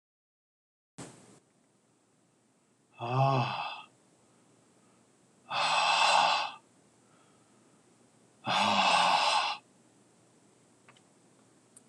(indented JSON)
{
  "exhalation_length": "11.9 s",
  "exhalation_amplitude": 8280,
  "exhalation_signal_mean_std_ratio": 0.41,
  "survey_phase": "beta (2021-08-13 to 2022-03-07)",
  "age": "45-64",
  "gender": "Male",
  "wearing_mask": "No",
  "symptom_new_continuous_cough": true,
  "symptom_runny_or_blocked_nose": true,
  "symptom_onset": "6 days",
  "smoker_status": "Never smoked",
  "respiratory_condition_asthma": true,
  "respiratory_condition_other": false,
  "recruitment_source": "REACT",
  "submission_delay": "1 day",
  "covid_test_result": "Positive",
  "covid_test_method": "RT-qPCR",
  "covid_ct_value": 13.0,
  "covid_ct_gene": "N gene",
  "influenza_a_test_result": "Negative",
  "influenza_b_test_result": "Negative"
}